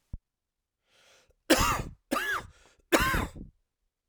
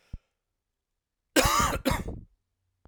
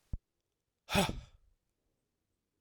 three_cough_length: 4.1 s
three_cough_amplitude: 14024
three_cough_signal_mean_std_ratio: 0.39
cough_length: 2.9 s
cough_amplitude: 14608
cough_signal_mean_std_ratio: 0.38
exhalation_length: 2.6 s
exhalation_amplitude: 5634
exhalation_signal_mean_std_ratio: 0.25
survey_phase: beta (2021-08-13 to 2022-03-07)
age: 45-64
gender: Male
wearing_mask: 'No'
symptom_cough_any: true
symptom_runny_or_blocked_nose: true
symptom_sore_throat: true
symptom_fatigue: true
symptom_headache: true
symptom_other: true
symptom_onset: 5 days
smoker_status: Never smoked
respiratory_condition_asthma: false
respiratory_condition_other: false
recruitment_source: Test and Trace
submission_delay: 2 days
covid_test_result: Positive
covid_test_method: RT-qPCR
covid_ct_value: 18.6
covid_ct_gene: ORF1ab gene
covid_ct_mean: 19.4
covid_viral_load: 430000 copies/ml
covid_viral_load_category: Low viral load (10K-1M copies/ml)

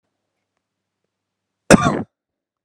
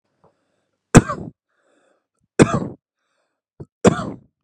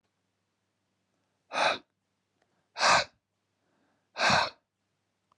cough_length: 2.6 s
cough_amplitude: 32768
cough_signal_mean_std_ratio: 0.21
three_cough_length: 4.4 s
three_cough_amplitude: 32768
three_cough_signal_mean_std_ratio: 0.23
exhalation_length: 5.4 s
exhalation_amplitude: 10219
exhalation_signal_mean_std_ratio: 0.3
survey_phase: alpha (2021-03-01 to 2021-08-12)
age: 18-44
gender: Male
wearing_mask: 'No'
symptom_fatigue: true
symptom_headache: true
smoker_status: Never smoked
respiratory_condition_asthma: true
respiratory_condition_other: false
recruitment_source: Test and Trace
submission_delay: 2 days
covid_test_result: Positive
covid_test_method: RT-qPCR
covid_ct_value: 34.2
covid_ct_gene: S gene
covid_ct_mean: 34.9
covid_viral_load: 3.5 copies/ml
covid_viral_load_category: Minimal viral load (< 10K copies/ml)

